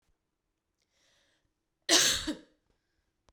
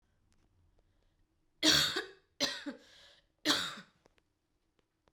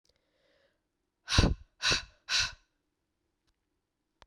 {"cough_length": "3.3 s", "cough_amplitude": 11639, "cough_signal_mean_std_ratio": 0.27, "three_cough_length": "5.1 s", "three_cough_amplitude": 7013, "three_cough_signal_mean_std_ratio": 0.32, "exhalation_length": "4.3 s", "exhalation_amplitude": 12716, "exhalation_signal_mean_std_ratio": 0.29, "survey_phase": "beta (2021-08-13 to 2022-03-07)", "age": "18-44", "gender": "Female", "wearing_mask": "No", "symptom_cough_any": true, "symptom_runny_or_blocked_nose": true, "symptom_sore_throat": true, "symptom_fatigue": true, "symptom_fever_high_temperature": true, "symptom_headache": true, "symptom_change_to_sense_of_smell_or_taste": true, "symptom_loss_of_taste": true, "symptom_other": true, "symptom_onset": "4 days", "smoker_status": "Never smoked", "respiratory_condition_asthma": true, "respiratory_condition_other": false, "recruitment_source": "Test and Trace", "submission_delay": "1 day", "covid_test_result": "Positive", "covid_test_method": "RT-qPCR"}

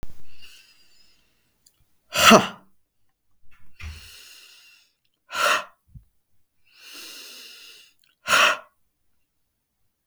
{"exhalation_length": "10.1 s", "exhalation_amplitude": 32768, "exhalation_signal_mean_std_ratio": 0.29, "survey_phase": "beta (2021-08-13 to 2022-03-07)", "age": "45-64", "gender": "Male", "wearing_mask": "No", "symptom_none": true, "smoker_status": "Ex-smoker", "respiratory_condition_asthma": false, "respiratory_condition_other": false, "recruitment_source": "REACT", "submission_delay": "2 days", "covid_test_result": "Negative", "covid_test_method": "RT-qPCR"}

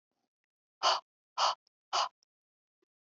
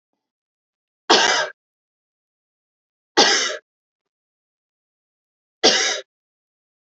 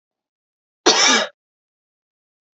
{"exhalation_length": "3.1 s", "exhalation_amplitude": 5626, "exhalation_signal_mean_std_ratio": 0.31, "three_cough_length": "6.8 s", "three_cough_amplitude": 32067, "three_cough_signal_mean_std_ratio": 0.3, "cough_length": "2.6 s", "cough_amplitude": 31799, "cough_signal_mean_std_ratio": 0.31, "survey_phase": "alpha (2021-03-01 to 2021-08-12)", "age": "18-44", "gender": "Female", "wearing_mask": "No", "symptom_none": true, "smoker_status": "Never smoked", "respiratory_condition_asthma": false, "respiratory_condition_other": false, "recruitment_source": "REACT", "submission_delay": "2 days", "covid_test_result": "Negative", "covid_test_method": "RT-qPCR"}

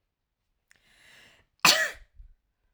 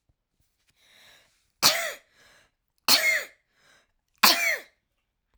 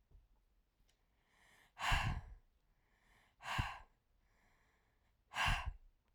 {"cough_length": "2.7 s", "cough_amplitude": 22040, "cough_signal_mean_std_ratio": 0.23, "three_cough_length": "5.4 s", "three_cough_amplitude": 26199, "three_cough_signal_mean_std_ratio": 0.32, "exhalation_length": "6.1 s", "exhalation_amplitude": 2563, "exhalation_signal_mean_std_ratio": 0.35, "survey_phase": "alpha (2021-03-01 to 2021-08-12)", "age": "18-44", "gender": "Female", "wearing_mask": "No", "symptom_cough_any": true, "symptom_headache": true, "smoker_status": "Ex-smoker", "respiratory_condition_asthma": false, "respiratory_condition_other": false, "recruitment_source": "REACT", "submission_delay": "1 day", "covid_test_result": "Negative", "covid_test_method": "RT-qPCR"}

